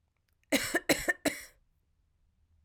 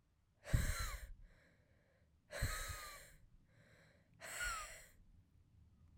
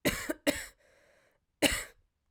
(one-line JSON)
{"three_cough_length": "2.6 s", "three_cough_amplitude": 11232, "three_cough_signal_mean_std_ratio": 0.33, "exhalation_length": "6.0 s", "exhalation_amplitude": 2887, "exhalation_signal_mean_std_ratio": 0.43, "cough_length": "2.3 s", "cough_amplitude": 11812, "cough_signal_mean_std_ratio": 0.36, "survey_phase": "alpha (2021-03-01 to 2021-08-12)", "age": "18-44", "gender": "Male", "wearing_mask": "No", "symptom_cough_any": true, "symptom_new_continuous_cough": true, "symptom_fatigue": true, "symptom_headache": true, "symptom_onset": "3 days", "smoker_status": "Ex-smoker", "respiratory_condition_asthma": false, "respiratory_condition_other": false, "recruitment_source": "Test and Trace", "submission_delay": "2 days", "covid_test_result": "Positive", "covid_test_method": "RT-qPCR", "covid_ct_value": 19.8, "covid_ct_gene": "ORF1ab gene", "covid_ct_mean": 20.2, "covid_viral_load": "230000 copies/ml", "covid_viral_load_category": "Low viral load (10K-1M copies/ml)"}